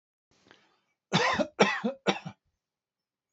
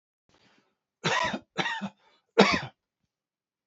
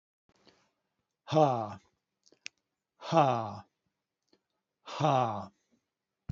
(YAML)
cough_length: 3.3 s
cough_amplitude: 18001
cough_signal_mean_std_ratio: 0.36
three_cough_length: 3.7 s
three_cough_amplitude: 24450
three_cough_signal_mean_std_ratio: 0.33
exhalation_length: 6.3 s
exhalation_amplitude: 9903
exhalation_signal_mean_std_ratio: 0.32
survey_phase: alpha (2021-03-01 to 2021-08-12)
age: 65+
gender: Male
wearing_mask: 'No'
symptom_none: true
smoker_status: Never smoked
respiratory_condition_asthma: false
respiratory_condition_other: false
recruitment_source: REACT
submission_delay: 3 days
covid_test_result: Negative
covid_test_method: RT-qPCR